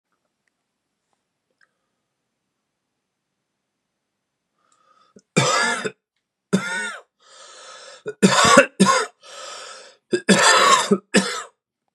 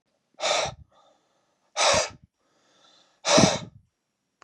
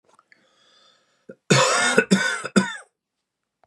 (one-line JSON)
{"three_cough_length": "11.9 s", "three_cough_amplitude": 32768, "three_cough_signal_mean_std_ratio": 0.36, "exhalation_length": "4.4 s", "exhalation_amplitude": 21308, "exhalation_signal_mean_std_ratio": 0.36, "cough_length": "3.7 s", "cough_amplitude": 25998, "cough_signal_mean_std_ratio": 0.41, "survey_phase": "beta (2021-08-13 to 2022-03-07)", "age": "45-64", "gender": "Male", "wearing_mask": "No", "symptom_cough_any": true, "symptom_runny_or_blocked_nose": true, "symptom_fatigue": true, "symptom_loss_of_taste": true, "smoker_status": "Ex-smoker", "respiratory_condition_asthma": false, "respiratory_condition_other": false, "recruitment_source": "Test and Trace", "submission_delay": "2 days", "covid_test_result": "Positive", "covid_test_method": "RT-qPCR", "covid_ct_value": 21.0, "covid_ct_gene": "ORF1ab gene", "covid_ct_mean": 21.2, "covid_viral_load": "110000 copies/ml", "covid_viral_load_category": "Low viral load (10K-1M copies/ml)"}